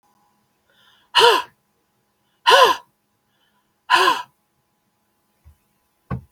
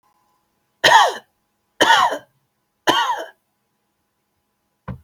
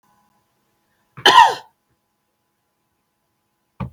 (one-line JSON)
{"exhalation_length": "6.3 s", "exhalation_amplitude": 32768, "exhalation_signal_mean_std_ratio": 0.3, "three_cough_length": "5.0 s", "three_cough_amplitude": 32768, "three_cough_signal_mean_std_ratio": 0.35, "cough_length": "3.9 s", "cough_amplitude": 32768, "cough_signal_mean_std_ratio": 0.22, "survey_phase": "beta (2021-08-13 to 2022-03-07)", "age": "45-64", "gender": "Female", "wearing_mask": "No", "symptom_none": true, "smoker_status": "Never smoked", "respiratory_condition_asthma": false, "respiratory_condition_other": false, "recruitment_source": "Test and Trace", "submission_delay": "2 days", "covid_test_result": "Negative", "covid_test_method": "RT-qPCR"}